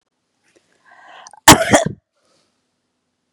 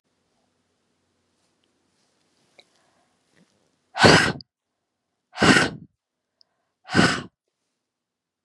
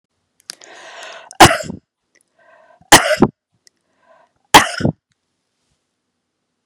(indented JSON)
{
  "cough_length": "3.3 s",
  "cough_amplitude": 32768,
  "cough_signal_mean_std_ratio": 0.23,
  "exhalation_length": "8.4 s",
  "exhalation_amplitude": 32354,
  "exhalation_signal_mean_std_ratio": 0.25,
  "three_cough_length": "6.7 s",
  "three_cough_amplitude": 32768,
  "three_cough_signal_mean_std_ratio": 0.25,
  "survey_phase": "beta (2021-08-13 to 2022-03-07)",
  "age": "45-64",
  "gender": "Female",
  "wearing_mask": "No",
  "symptom_none": true,
  "smoker_status": "Never smoked",
  "respiratory_condition_asthma": false,
  "respiratory_condition_other": false,
  "recruitment_source": "REACT",
  "submission_delay": "2 days",
  "covid_test_result": "Negative",
  "covid_test_method": "RT-qPCR",
  "influenza_a_test_result": "Negative",
  "influenza_b_test_result": "Negative"
}